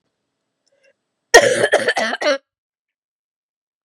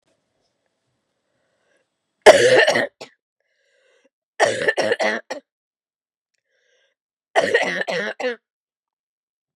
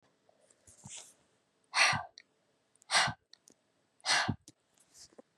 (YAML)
cough_length: 3.8 s
cough_amplitude: 32768
cough_signal_mean_std_ratio: 0.33
three_cough_length: 9.6 s
three_cough_amplitude: 32768
three_cough_signal_mean_std_ratio: 0.32
exhalation_length: 5.4 s
exhalation_amplitude: 7317
exhalation_signal_mean_std_ratio: 0.31
survey_phase: beta (2021-08-13 to 2022-03-07)
age: 45-64
gender: Female
wearing_mask: 'No'
symptom_cough_any: true
symptom_runny_or_blocked_nose: true
smoker_status: Never smoked
respiratory_condition_asthma: false
respiratory_condition_other: false
recruitment_source: Test and Trace
submission_delay: 2 days
covid_test_result: Positive
covid_test_method: ePCR